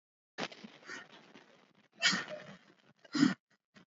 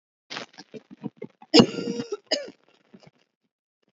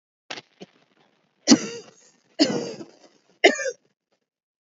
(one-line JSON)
{"exhalation_length": "3.9 s", "exhalation_amplitude": 6811, "exhalation_signal_mean_std_ratio": 0.31, "cough_length": "3.9 s", "cough_amplitude": 27237, "cough_signal_mean_std_ratio": 0.25, "three_cough_length": "4.7 s", "three_cough_amplitude": 28335, "three_cough_signal_mean_std_ratio": 0.27, "survey_phase": "alpha (2021-03-01 to 2021-08-12)", "age": "18-44", "gender": "Female", "wearing_mask": "No", "symptom_none": true, "symptom_onset": "11 days", "smoker_status": "Never smoked", "respiratory_condition_asthma": false, "respiratory_condition_other": false, "recruitment_source": "REACT", "submission_delay": "1 day", "covid_test_result": "Negative", "covid_test_method": "RT-qPCR"}